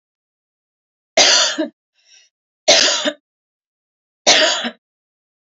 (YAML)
three_cough_length: 5.5 s
three_cough_amplitude: 32767
three_cough_signal_mean_std_ratio: 0.38
survey_phase: beta (2021-08-13 to 2022-03-07)
age: 45-64
gender: Female
wearing_mask: 'No'
symptom_cough_any: true
smoker_status: Current smoker (e-cigarettes or vapes only)
respiratory_condition_asthma: false
respiratory_condition_other: false
recruitment_source: REACT
submission_delay: 2 days
covid_test_result: Negative
covid_test_method: RT-qPCR
influenza_a_test_result: Negative
influenza_b_test_result: Negative